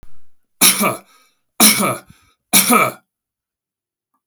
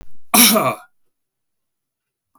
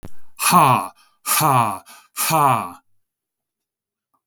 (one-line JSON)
{"three_cough_length": "4.3 s", "three_cough_amplitude": 32768, "three_cough_signal_mean_std_ratio": 0.41, "cough_length": "2.4 s", "cough_amplitude": 32766, "cough_signal_mean_std_ratio": 0.38, "exhalation_length": "4.3 s", "exhalation_amplitude": 31481, "exhalation_signal_mean_std_ratio": 0.49, "survey_phase": "beta (2021-08-13 to 2022-03-07)", "age": "45-64", "gender": "Male", "wearing_mask": "No", "symptom_none": true, "smoker_status": "Never smoked", "respiratory_condition_asthma": false, "respiratory_condition_other": false, "recruitment_source": "REACT", "submission_delay": "1 day", "covid_test_result": "Negative", "covid_test_method": "RT-qPCR", "influenza_a_test_result": "Negative", "influenza_b_test_result": "Negative"}